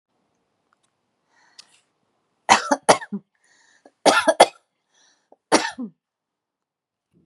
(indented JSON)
{
  "three_cough_length": "7.3 s",
  "three_cough_amplitude": 32767,
  "three_cough_signal_mean_std_ratio": 0.24,
  "survey_phase": "beta (2021-08-13 to 2022-03-07)",
  "age": "45-64",
  "gender": "Female",
  "wearing_mask": "No",
  "symptom_none": true,
  "smoker_status": "Never smoked",
  "respiratory_condition_asthma": false,
  "respiratory_condition_other": false,
  "recruitment_source": "REACT",
  "submission_delay": "2 days",
  "covid_test_result": "Negative",
  "covid_test_method": "RT-qPCR",
  "influenza_a_test_result": "Negative",
  "influenza_b_test_result": "Negative"
}